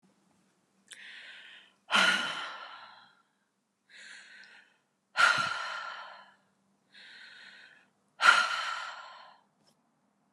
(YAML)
exhalation_length: 10.3 s
exhalation_amplitude: 14518
exhalation_signal_mean_std_ratio: 0.34
survey_phase: alpha (2021-03-01 to 2021-08-12)
age: 18-44
gender: Female
wearing_mask: 'No'
symptom_fatigue: true
symptom_headache: true
symptom_onset: 12 days
smoker_status: Ex-smoker
respiratory_condition_asthma: false
respiratory_condition_other: false
recruitment_source: REACT
submission_delay: 1 day
covid_test_result: Negative
covid_test_method: RT-qPCR